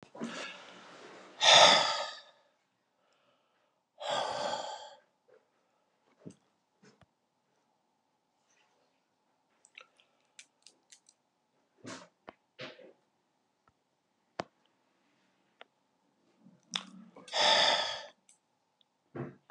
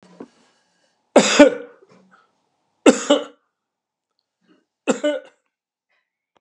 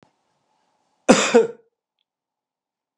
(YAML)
exhalation_length: 19.5 s
exhalation_amplitude: 14774
exhalation_signal_mean_std_ratio: 0.24
three_cough_length: 6.4 s
three_cough_amplitude: 32768
three_cough_signal_mean_std_ratio: 0.25
cough_length: 3.0 s
cough_amplitude: 32768
cough_signal_mean_std_ratio: 0.25
survey_phase: beta (2021-08-13 to 2022-03-07)
age: 65+
gender: Male
wearing_mask: 'No'
symptom_none: true
smoker_status: Ex-smoker
respiratory_condition_asthma: false
respiratory_condition_other: false
recruitment_source: REACT
submission_delay: 2 days
covid_test_result: Negative
covid_test_method: RT-qPCR
influenza_a_test_result: Negative
influenza_b_test_result: Negative